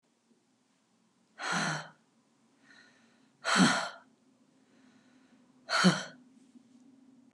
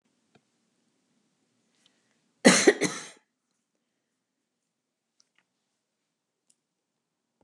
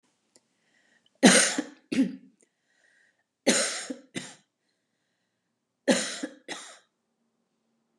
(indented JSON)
{
  "exhalation_length": "7.3 s",
  "exhalation_amplitude": 8815,
  "exhalation_signal_mean_std_ratio": 0.31,
  "cough_length": "7.4 s",
  "cough_amplitude": 23344,
  "cough_signal_mean_std_ratio": 0.16,
  "three_cough_length": "8.0 s",
  "three_cough_amplitude": 23063,
  "three_cough_signal_mean_std_ratio": 0.29,
  "survey_phase": "beta (2021-08-13 to 2022-03-07)",
  "age": "65+",
  "gender": "Female",
  "wearing_mask": "No",
  "symptom_none": true,
  "smoker_status": "Never smoked",
  "respiratory_condition_asthma": false,
  "respiratory_condition_other": false,
  "recruitment_source": "Test and Trace",
  "submission_delay": "1 day",
  "covid_test_result": "Negative",
  "covid_test_method": "RT-qPCR"
}